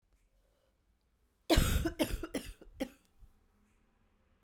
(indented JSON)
{
  "cough_length": "4.4 s",
  "cough_amplitude": 7569,
  "cough_signal_mean_std_ratio": 0.33,
  "survey_phase": "beta (2021-08-13 to 2022-03-07)",
  "age": "18-44",
  "gender": "Female",
  "wearing_mask": "No",
  "symptom_cough_any": true,
  "symptom_runny_or_blocked_nose": true,
  "symptom_onset": "3 days",
  "smoker_status": "Never smoked",
  "respiratory_condition_asthma": false,
  "respiratory_condition_other": false,
  "recruitment_source": "Test and Trace",
  "submission_delay": "2 days",
  "covid_test_result": "Positive",
  "covid_test_method": "RT-qPCR",
  "covid_ct_value": 17.7,
  "covid_ct_gene": "ORF1ab gene"
}